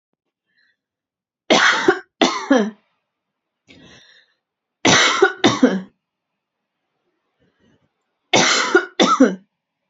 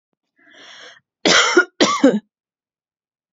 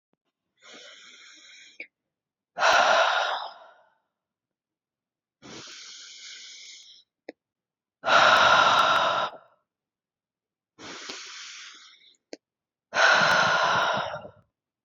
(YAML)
three_cough_length: 9.9 s
three_cough_amplitude: 31699
three_cough_signal_mean_std_ratio: 0.39
cough_length: 3.3 s
cough_amplitude: 31667
cough_signal_mean_std_ratio: 0.37
exhalation_length: 14.8 s
exhalation_amplitude: 19010
exhalation_signal_mean_std_ratio: 0.42
survey_phase: beta (2021-08-13 to 2022-03-07)
age: 18-44
gender: Female
wearing_mask: 'No'
symptom_runny_or_blocked_nose: true
symptom_sore_throat: true
symptom_onset: 7 days
smoker_status: Never smoked
respiratory_condition_asthma: false
respiratory_condition_other: false
recruitment_source: REACT
submission_delay: 1 day
covid_test_result: Negative
covid_test_method: RT-qPCR
influenza_a_test_result: Negative
influenza_b_test_result: Negative